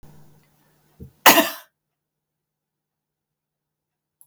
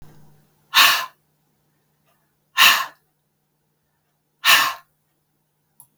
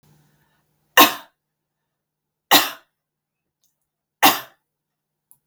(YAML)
cough_length: 4.3 s
cough_amplitude: 32768
cough_signal_mean_std_ratio: 0.17
exhalation_length: 6.0 s
exhalation_amplitude: 32768
exhalation_signal_mean_std_ratio: 0.29
three_cough_length: 5.5 s
three_cough_amplitude: 32768
three_cough_signal_mean_std_ratio: 0.22
survey_phase: beta (2021-08-13 to 2022-03-07)
age: 65+
gender: Female
wearing_mask: 'No'
symptom_none: true
smoker_status: Never smoked
respiratory_condition_asthma: false
respiratory_condition_other: false
recruitment_source: REACT
submission_delay: 3 days
covid_test_result: Negative
covid_test_method: RT-qPCR
influenza_a_test_result: Negative
influenza_b_test_result: Negative